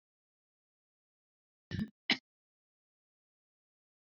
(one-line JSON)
{"cough_length": "4.0 s", "cough_amplitude": 5738, "cough_signal_mean_std_ratio": 0.15, "survey_phase": "beta (2021-08-13 to 2022-03-07)", "age": "45-64", "gender": "Female", "wearing_mask": "No", "symptom_none": true, "symptom_onset": "8 days", "smoker_status": "Never smoked", "respiratory_condition_asthma": false, "respiratory_condition_other": false, "recruitment_source": "REACT", "submission_delay": "1 day", "covid_test_result": "Negative", "covid_test_method": "RT-qPCR"}